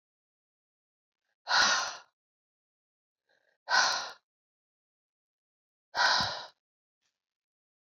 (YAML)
exhalation_length: 7.9 s
exhalation_amplitude: 9870
exhalation_signal_mean_std_ratio: 0.31
survey_phase: beta (2021-08-13 to 2022-03-07)
age: 45-64
gender: Female
wearing_mask: 'No'
symptom_cough_any: true
symptom_runny_or_blocked_nose: true
symptom_fatigue: true
symptom_change_to_sense_of_smell_or_taste: true
symptom_onset: 5 days
smoker_status: Ex-smoker
respiratory_condition_asthma: false
respiratory_condition_other: false
recruitment_source: Test and Trace
submission_delay: 2 days
covid_test_result: Positive
covid_test_method: RT-qPCR
covid_ct_value: 15.1
covid_ct_gene: ORF1ab gene
covid_ct_mean: 15.4
covid_viral_load: 8900000 copies/ml
covid_viral_load_category: High viral load (>1M copies/ml)